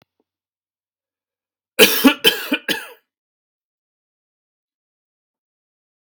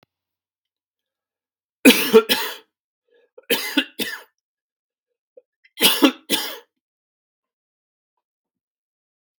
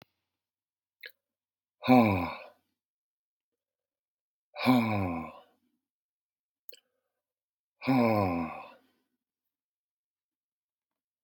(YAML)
cough_length: 6.1 s
cough_amplitude: 32768
cough_signal_mean_std_ratio: 0.23
three_cough_length: 9.4 s
three_cough_amplitude: 32767
three_cough_signal_mean_std_ratio: 0.26
exhalation_length: 11.2 s
exhalation_amplitude: 12130
exhalation_signal_mean_std_ratio: 0.3
survey_phase: beta (2021-08-13 to 2022-03-07)
age: 45-64
gender: Male
wearing_mask: 'No'
symptom_cough_any: true
symptom_runny_or_blocked_nose: true
symptom_change_to_sense_of_smell_or_taste: true
symptom_onset: 5 days
smoker_status: Never smoked
respiratory_condition_asthma: false
respiratory_condition_other: false
recruitment_source: Test and Trace
submission_delay: 1 day
covid_test_result: Positive
covid_test_method: RT-qPCR
covid_ct_value: 21.5
covid_ct_gene: N gene